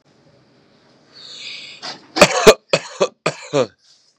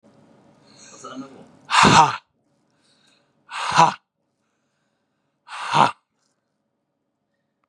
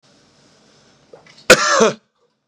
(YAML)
three_cough_length: 4.2 s
three_cough_amplitude: 32768
three_cough_signal_mean_std_ratio: 0.3
exhalation_length: 7.7 s
exhalation_amplitude: 32586
exhalation_signal_mean_std_ratio: 0.28
cough_length: 2.5 s
cough_amplitude: 32768
cough_signal_mean_std_ratio: 0.31
survey_phase: beta (2021-08-13 to 2022-03-07)
age: 18-44
gender: Male
wearing_mask: 'Yes'
symptom_none: true
smoker_status: Never smoked
respiratory_condition_asthma: true
respiratory_condition_other: false
recruitment_source: REACT
submission_delay: 2 days
covid_test_result: Negative
covid_test_method: RT-qPCR
influenza_a_test_result: Negative
influenza_b_test_result: Negative